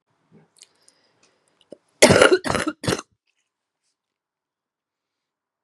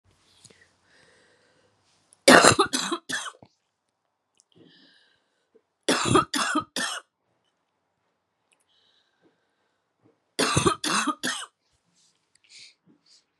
cough_length: 5.6 s
cough_amplitude: 32768
cough_signal_mean_std_ratio: 0.24
three_cough_length: 13.4 s
three_cough_amplitude: 32767
three_cough_signal_mean_std_ratio: 0.28
survey_phase: beta (2021-08-13 to 2022-03-07)
age: 45-64
gender: Female
wearing_mask: 'No'
symptom_cough_any: true
symptom_fatigue: true
symptom_change_to_sense_of_smell_or_taste: true
symptom_other: true
symptom_onset: 3 days
smoker_status: Never smoked
respiratory_condition_asthma: false
respiratory_condition_other: false
recruitment_source: Test and Trace
submission_delay: 1 day
covid_test_result: Positive
covid_test_method: RT-qPCR
covid_ct_value: 21.2
covid_ct_gene: ORF1ab gene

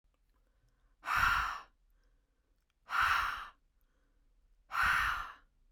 exhalation_length: 5.7 s
exhalation_amplitude: 4107
exhalation_signal_mean_std_ratio: 0.45
survey_phase: beta (2021-08-13 to 2022-03-07)
age: 18-44
gender: Female
wearing_mask: 'No'
symptom_diarrhoea: true
symptom_fatigue: true
symptom_headache: true
symptom_change_to_sense_of_smell_or_taste: true
smoker_status: Ex-smoker
respiratory_condition_asthma: false
respiratory_condition_other: false
recruitment_source: REACT
submission_delay: 2 days
covid_test_result: Negative
covid_test_method: RT-qPCR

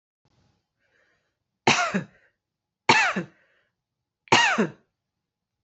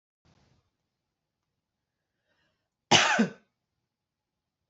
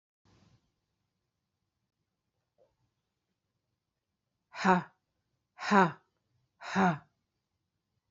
three_cough_length: 5.6 s
three_cough_amplitude: 26230
three_cough_signal_mean_std_ratio: 0.32
cough_length: 4.7 s
cough_amplitude: 19216
cough_signal_mean_std_ratio: 0.21
exhalation_length: 8.1 s
exhalation_amplitude: 13540
exhalation_signal_mean_std_ratio: 0.22
survey_phase: beta (2021-08-13 to 2022-03-07)
age: 45-64
gender: Female
wearing_mask: 'No'
symptom_runny_or_blocked_nose: true
symptom_fatigue: true
symptom_headache: true
symptom_onset: 6 days
smoker_status: Ex-smoker
respiratory_condition_asthma: false
respiratory_condition_other: false
recruitment_source: REACT
submission_delay: 1 day
covid_test_result: Negative
covid_test_method: RT-qPCR
influenza_a_test_result: Unknown/Void
influenza_b_test_result: Unknown/Void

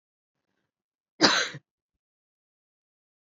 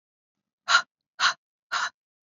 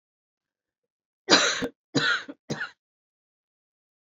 cough_length: 3.3 s
cough_amplitude: 21061
cough_signal_mean_std_ratio: 0.21
exhalation_length: 2.4 s
exhalation_amplitude: 14562
exhalation_signal_mean_std_ratio: 0.31
three_cough_length: 4.1 s
three_cough_amplitude: 19511
three_cough_signal_mean_std_ratio: 0.32
survey_phase: beta (2021-08-13 to 2022-03-07)
age: 45-64
gender: Female
wearing_mask: 'No'
symptom_cough_any: true
symptom_runny_or_blocked_nose: true
symptom_onset: 11 days
smoker_status: Ex-smoker
respiratory_condition_asthma: false
respiratory_condition_other: false
recruitment_source: REACT
submission_delay: 3 days
covid_test_result: Negative
covid_test_method: RT-qPCR
influenza_a_test_result: Negative
influenza_b_test_result: Negative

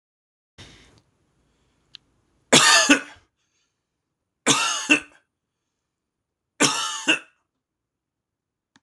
three_cough_length: 8.8 s
three_cough_amplitude: 26028
three_cough_signal_mean_std_ratio: 0.29
survey_phase: alpha (2021-03-01 to 2021-08-12)
age: 45-64
gender: Male
wearing_mask: 'No'
symptom_none: true
smoker_status: Never smoked
respiratory_condition_asthma: false
respiratory_condition_other: false
recruitment_source: REACT
submission_delay: 1 day
covid_test_result: Negative
covid_test_method: RT-qPCR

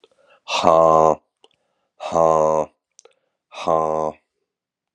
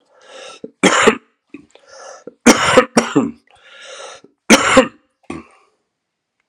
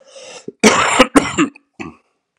exhalation_length: 4.9 s
exhalation_amplitude: 32767
exhalation_signal_mean_std_ratio: 0.4
three_cough_length: 6.5 s
three_cough_amplitude: 32768
three_cough_signal_mean_std_ratio: 0.36
cough_length: 2.4 s
cough_amplitude: 32768
cough_signal_mean_std_ratio: 0.43
survey_phase: alpha (2021-03-01 to 2021-08-12)
age: 45-64
gender: Male
wearing_mask: 'No'
symptom_cough_any: true
symptom_fever_high_temperature: true
symptom_change_to_sense_of_smell_or_taste: true
symptom_onset: 4 days
smoker_status: Never smoked
respiratory_condition_asthma: false
respiratory_condition_other: false
recruitment_source: Test and Trace
submission_delay: 2 days
covid_test_result: Positive
covid_test_method: RT-qPCR
covid_ct_value: 25.0
covid_ct_gene: ORF1ab gene
covid_ct_mean: 25.8
covid_viral_load: 3500 copies/ml
covid_viral_load_category: Minimal viral load (< 10K copies/ml)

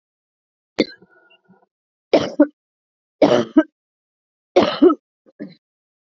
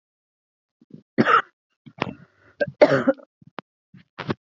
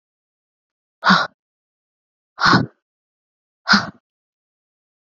three_cough_length: 6.1 s
three_cough_amplitude: 30137
three_cough_signal_mean_std_ratio: 0.28
cough_length: 4.4 s
cough_amplitude: 32008
cough_signal_mean_std_ratio: 0.29
exhalation_length: 5.1 s
exhalation_amplitude: 29812
exhalation_signal_mean_std_ratio: 0.27
survey_phase: beta (2021-08-13 to 2022-03-07)
age: 18-44
gender: Female
wearing_mask: 'No'
symptom_cough_any: true
symptom_sore_throat: true
symptom_fatigue: true
symptom_headache: true
symptom_change_to_sense_of_smell_or_taste: true
symptom_loss_of_taste: true
symptom_other: true
symptom_onset: 5 days
smoker_status: Never smoked
respiratory_condition_asthma: false
respiratory_condition_other: false
recruitment_source: Test and Trace
submission_delay: 2 days
covid_test_result: Positive
covid_test_method: RT-qPCR
covid_ct_value: 20.1
covid_ct_gene: ORF1ab gene
covid_ct_mean: 20.6
covid_viral_load: 180000 copies/ml
covid_viral_load_category: Low viral load (10K-1M copies/ml)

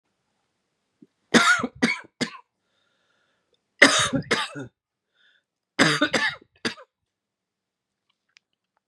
three_cough_length: 8.9 s
three_cough_amplitude: 32767
three_cough_signal_mean_std_ratio: 0.31
survey_phase: beta (2021-08-13 to 2022-03-07)
age: 45-64
gender: Male
wearing_mask: 'No'
symptom_cough_any: true
symptom_new_continuous_cough: true
symptom_runny_or_blocked_nose: true
symptom_fatigue: true
symptom_fever_high_temperature: true
symptom_headache: true
symptom_change_to_sense_of_smell_or_taste: true
symptom_loss_of_taste: true
symptom_onset: 3 days
smoker_status: Never smoked
respiratory_condition_asthma: false
respiratory_condition_other: false
recruitment_source: Test and Trace
submission_delay: 2 days
covid_test_result: Positive
covid_test_method: RT-qPCR
covid_ct_value: 26.0
covid_ct_gene: ORF1ab gene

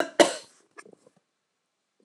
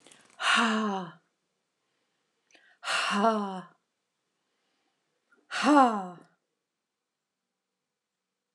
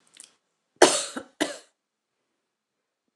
cough_length: 2.0 s
cough_amplitude: 27950
cough_signal_mean_std_ratio: 0.2
exhalation_length: 8.5 s
exhalation_amplitude: 15486
exhalation_signal_mean_std_ratio: 0.35
three_cough_length: 3.2 s
three_cough_amplitude: 29203
three_cough_signal_mean_std_ratio: 0.21
survey_phase: beta (2021-08-13 to 2022-03-07)
age: 45-64
gender: Female
wearing_mask: 'No'
symptom_none: true
smoker_status: Never smoked
respiratory_condition_asthma: false
respiratory_condition_other: false
recruitment_source: REACT
submission_delay: 2 days
covid_test_result: Negative
covid_test_method: RT-qPCR
influenza_a_test_result: Negative
influenza_b_test_result: Negative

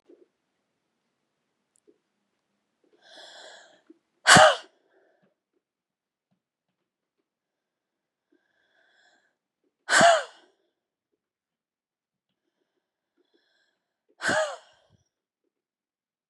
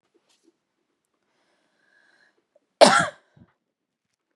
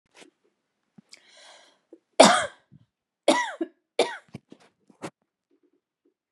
exhalation_length: 16.3 s
exhalation_amplitude: 31474
exhalation_signal_mean_std_ratio: 0.17
cough_length: 4.4 s
cough_amplitude: 31947
cough_signal_mean_std_ratio: 0.17
three_cough_length: 6.3 s
three_cough_amplitude: 32767
three_cough_signal_mean_std_ratio: 0.22
survey_phase: beta (2021-08-13 to 2022-03-07)
age: 18-44
gender: Female
wearing_mask: 'No'
symptom_cough_any: true
symptom_onset: 5 days
smoker_status: Ex-smoker
respiratory_condition_asthma: false
respiratory_condition_other: false
recruitment_source: REACT
submission_delay: 1 day
covid_test_result: Negative
covid_test_method: RT-qPCR
influenza_a_test_result: Negative
influenza_b_test_result: Negative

